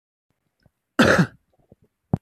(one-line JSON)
{"cough_length": "2.2 s", "cough_amplitude": 23004, "cough_signal_mean_std_ratio": 0.29, "survey_phase": "beta (2021-08-13 to 2022-03-07)", "age": "45-64", "gender": "Female", "wearing_mask": "No", "symptom_cough_any": true, "symptom_runny_or_blocked_nose": true, "symptom_onset": "4 days", "smoker_status": "Current smoker (11 or more cigarettes per day)", "respiratory_condition_asthma": false, "respiratory_condition_other": false, "recruitment_source": "REACT", "submission_delay": "1 day", "covid_test_result": "Negative", "covid_test_method": "RT-qPCR"}